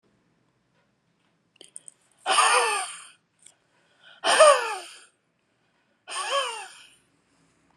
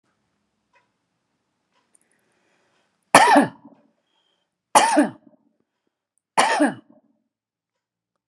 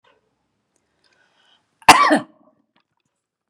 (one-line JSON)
{"exhalation_length": "7.8 s", "exhalation_amplitude": 22211, "exhalation_signal_mean_std_ratio": 0.33, "three_cough_length": "8.3 s", "three_cough_amplitude": 32768, "three_cough_signal_mean_std_ratio": 0.27, "cough_length": "3.5 s", "cough_amplitude": 32768, "cough_signal_mean_std_ratio": 0.22, "survey_phase": "beta (2021-08-13 to 2022-03-07)", "age": "65+", "gender": "Female", "wearing_mask": "No", "symptom_none": true, "smoker_status": "Never smoked", "respiratory_condition_asthma": false, "respiratory_condition_other": false, "recruitment_source": "REACT", "submission_delay": "4 days", "covid_test_result": "Negative", "covid_test_method": "RT-qPCR"}